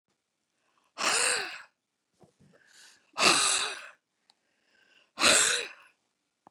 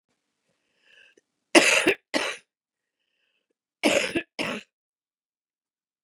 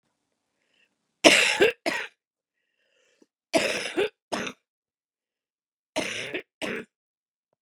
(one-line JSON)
{"exhalation_length": "6.5 s", "exhalation_amplitude": 13788, "exhalation_signal_mean_std_ratio": 0.37, "cough_length": "6.0 s", "cough_amplitude": 28149, "cough_signal_mean_std_ratio": 0.28, "three_cough_length": "7.6 s", "three_cough_amplitude": 32335, "three_cough_signal_mean_std_ratio": 0.31, "survey_phase": "beta (2021-08-13 to 2022-03-07)", "age": "45-64", "gender": "Female", "wearing_mask": "No", "symptom_cough_any": true, "symptom_runny_or_blocked_nose": true, "symptom_shortness_of_breath": true, "symptom_sore_throat": true, "symptom_abdominal_pain": true, "symptom_fatigue": true, "symptom_fever_high_temperature": true, "symptom_headache": true, "symptom_change_to_sense_of_smell_or_taste": true, "symptom_onset": "4 days", "smoker_status": "Current smoker (e-cigarettes or vapes only)", "respiratory_condition_asthma": false, "respiratory_condition_other": false, "recruitment_source": "Test and Trace", "submission_delay": "1 day", "covid_test_result": "Negative", "covid_test_method": "RT-qPCR"}